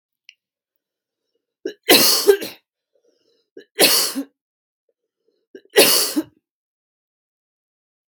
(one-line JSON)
{"three_cough_length": "8.1 s", "three_cough_amplitude": 32768, "three_cough_signal_mean_std_ratio": 0.31, "survey_phase": "beta (2021-08-13 to 2022-03-07)", "age": "18-44", "gender": "Female", "wearing_mask": "No", "symptom_cough_any": true, "symptom_runny_or_blocked_nose": true, "symptom_onset": "3 days", "smoker_status": "Ex-smoker", "respiratory_condition_asthma": true, "respiratory_condition_other": false, "recruitment_source": "Test and Trace", "submission_delay": "2 days", "covid_test_result": "Positive", "covid_test_method": "RT-qPCR", "covid_ct_value": 30.7, "covid_ct_gene": "ORF1ab gene"}